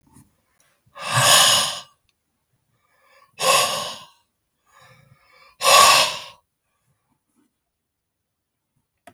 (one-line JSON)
{"exhalation_length": "9.1 s", "exhalation_amplitude": 32768, "exhalation_signal_mean_std_ratio": 0.33, "survey_phase": "beta (2021-08-13 to 2022-03-07)", "age": "65+", "gender": "Male", "wearing_mask": "No", "symptom_none": true, "smoker_status": "Current smoker (e-cigarettes or vapes only)", "respiratory_condition_asthma": false, "respiratory_condition_other": false, "recruitment_source": "REACT", "submission_delay": "3 days", "covid_test_result": "Negative", "covid_test_method": "RT-qPCR", "influenza_a_test_result": "Unknown/Void", "influenza_b_test_result": "Unknown/Void"}